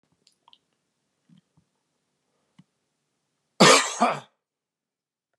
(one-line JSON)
{"cough_length": "5.4 s", "cough_amplitude": 28033, "cough_signal_mean_std_ratio": 0.21, "survey_phase": "beta (2021-08-13 to 2022-03-07)", "age": "65+", "gender": "Male", "wearing_mask": "No", "symptom_none": true, "symptom_onset": "12 days", "smoker_status": "Ex-smoker", "respiratory_condition_asthma": false, "respiratory_condition_other": false, "recruitment_source": "REACT", "submission_delay": "2 days", "covid_test_result": "Negative", "covid_test_method": "RT-qPCR", "influenza_a_test_result": "Negative", "influenza_b_test_result": "Negative"}